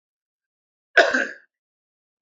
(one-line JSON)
{"cough_length": "2.2 s", "cough_amplitude": 28951, "cough_signal_mean_std_ratio": 0.26, "survey_phase": "beta (2021-08-13 to 2022-03-07)", "age": "65+", "gender": "Male", "wearing_mask": "No", "symptom_none": true, "smoker_status": "Ex-smoker", "respiratory_condition_asthma": false, "respiratory_condition_other": false, "recruitment_source": "REACT", "submission_delay": "2 days", "covid_test_result": "Negative", "covid_test_method": "RT-qPCR"}